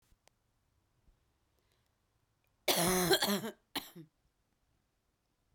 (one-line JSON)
{"cough_length": "5.5 s", "cough_amplitude": 6435, "cough_signal_mean_std_ratio": 0.31, "survey_phase": "beta (2021-08-13 to 2022-03-07)", "age": "18-44", "gender": "Female", "wearing_mask": "No", "symptom_cough_any": true, "smoker_status": "Never smoked", "respiratory_condition_asthma": true, "respiratory_condition_other": false, "recruitment_source": "Test and Trace", "submission_delay": "1 day", "covid_test_result": "Positive", "covid_test_method": "RT-qPCR"}